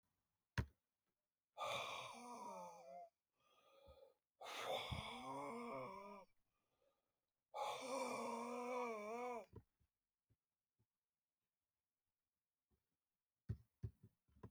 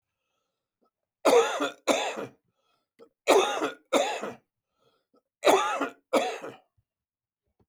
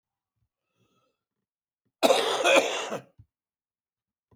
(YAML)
exhalation_length: 14.5 s
exhalation_amplitude: 1011
exhalation_signal_mean_std_ratio: 0.51
three_cough_length: 7.7 s
three_cough_amplitude: 17480
three_cough_signal_mean_std_ratio: 0.4
cough_length: 4.4 s
cough_amplitude: 17045
cough_signal_mean_std_ratio: 0.33
survey_phase: beta (2021-08-13 to 2022-03-07)
age: 65+
gender: Male
wearing_mask: 'No'
symptom_cough_any: true
smoker_status: Ex-smoker
respiratory_condition_asthma: true
respiratory_condition_other: false
recruitment_source: REACT
submission_delay: 6 days
covid_test_result: Negative
covid_test_method: RT-qPCR